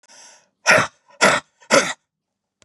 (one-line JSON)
{"exhalation_length": "2.6 s", "exhalation_amplitude": 32261, "exhalation_signal_mean_std_ratio": 0.37, "survey_phase": "beta (2021-08-13 to 2022-03-07)", "age": "45-64", "gender": "Female", "wearing_mask": "No", "symptom_cough_any": true, "symptom_sore_throat": true, "symptom_headache": true, "symptom_other": true, "symptom_onset": "8 days", "smoker_status": "Never smoked", "respiratory_condition_asthma": false, "respiratory_condition_other": false, "recruitment_source": "Test and Trace", "submission_delay": "2 days", "covid_test_result": "Positive", "covid_test_method": "RT-qPCR", "covid_ct_value": 32.7, "covid_ct_gene": "N gene"}